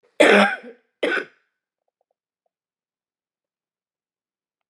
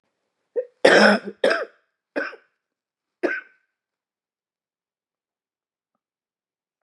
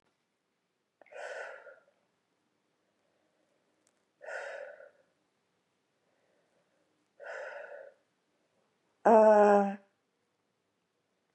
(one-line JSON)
{"cough_length": "4.7 s", "cough_amplitude": 30576, "cough_signal_mean_std_ratio": 0.25, "three_cough_length": "6.8 s", "three_cough_amplitude": 32027, "three_cough_signal_mean_std_ratio": 0.26, "exhalation_length": "11.3 s", "exhalation_amplitude": 9351, "exhalation_signal_mean_std_ratio": 0.22, "survey_phase": "beta (2021-08-13 to 2022-03-07)", "age": "45-64", "gender": "Female", "wearing_mask": "No", "symptom_cough_any": true, "symptom_sore_throat": true, "symptom_headache": true, "symptom_onset": "4 days", "smoker_status": "Prefer not to say", "respiratory_condition_asthma": false, "respiratory_condition_other": false, "recruitment_source": "Test and Trace", "submission_delay": "3 days", "covid_test_result": "Negative", "covid_test_method": "ePCR"}